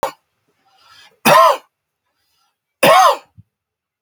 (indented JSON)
{
  "three_cough_length": "4.0 s",
  "three_cough_amplitude": 32768,
  "three_cough_signal_mean_std_ratio": 0.35,
  "survey_phase": "beta (2021-08-13 to 2022-03-07)",
  "age": "65+",
  "gender": "Male",
  "wearing_mask": "No",
  "symptom_cough_any": true,
  "symptom_runny_or_blocked_nose": true,
  "symptom_fatigue": true,
  "smoker_status": "Never smoked",
  "respiratory_condition_asthma": false,
  "respiratory_condition_other": false,
  "recruitment_source": "REACT",
  "submission_delay": "2 days",
  "covid_test_result": "Negative",
  "covid_test_method": "RT-qPCR",
  "influenza_a_test_result": "Negative",
  "influenza_b_test_result": "Negative"
}